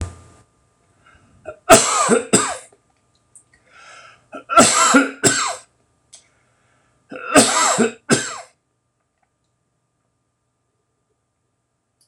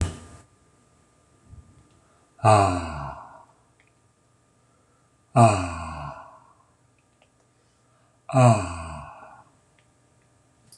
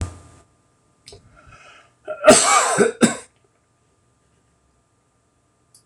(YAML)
three_cough_length: 12.1 s
three_cough_amplitude: 26028
three_cough_signal_mean_std_ratio: 0.35
exhalation_length: 10.8 s
exhalation_amplitude: 25054
exhalation_signal_mean_std_ratio: 0.29
cough_length: 5.9 s
cough_amplitude: 26028
cough_signal_mean_std_ratio: 0.3
survey_phase: beta (2021-08-13 to 2022-03-07)
age: 45-64
gender: Male
wearing_mask: 'No'
symptom_none: true
smoker_status: Never smoked
respiratory_condition_asthma: false
respiratory_condition_other: false
recruitment_source: REACT
submission_delay: 3 days
covid_test_result: Negative
covid_test_method: RT-qPCR
influenza_a_test_result: Negative
influenza_b_test_result: Negative